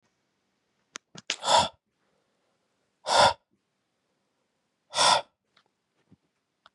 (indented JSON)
{
  "exhalation_length": "6.7 s",
  "exhalation_amplitude": 16984,
  "exhalation_signal_mean_std_ratio": 0.26,
  "survey_phase": "beta (2021-08-13 to 2022-03-07)",
  "age": "18-44",
  "gender": "Male",
  "wearing_mask": "No",
  "symptom_cough_any": true,
  "symptom_runny_or_blocked_nose": true,
  "symptom_sore_throat": true,
  "symptom_abdominal_pain": true,
  "symptom_fatigue": true,
  "symptom_fever_high_temperature": true,
  "symptom_headache": true,
  "symptom_loss_of_taste": true,
  "symptom_onset": "3 days",
  "smoker_status": "Never smoked",
  "respiratory_condition_asthma": false,
  "respiratory_condition_other": false,
  "recruitment_source": "Test and Trace",
  "submission_delay": "1 day",
  "covid_test_result": "Positive",
  "covid_test_method": "RT-qPCR",
  "covid_ct_value": 15.8,
  "covid_ct_gene": "ORF1ab gene",
  "covid_ct_mean": 16.1,
  "covid_viral_load": "5400000 copies/ml",
  "covid_viral_load_category": "High viral load (>1M copies/ml)"
}